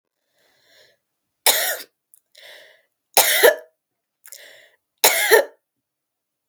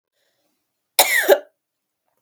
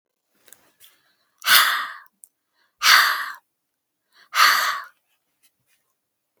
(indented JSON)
{
  "three_cough_length": "6.5 s",
  "three_cough_amplitude": 32768,
  "three_cough_signal_mean_std_ratio": 0.3,
  "cough_length": "2.2 s",
  "cough_amplitude": 32768,
  "cough_signal_mean_std_ratio": 0.3,
  "exhalation_length": "6.4 s",
  "exhalation_amplitude": 32246,
  "exhalation_signal_mean_std_ratio": 0.34,
  "survey_phase": "beta (2021-08-13 to 2022-03-07)",
  "age": "18-44",
  "gender": "Female",
  "wearing_mask": "No",
  "symptom_cough_any": true,
  "symptom_runny_or_blocked_nose": true,
  "symptom_onset": "7 days",
  "smoker_status": "Never smoked",
  "respiratory_condition_asthma": false,
  "respiratory_condition_other": false,
  "recruitment_source": "REACT",
  "submission_delay": "1 day",
  "covid_test_result": "Negative",
  "covid_test_method": "RT-qPCR",
  "influenza_a_test_result": "Negative",
  "influenza_b_test_result": "Negative"
}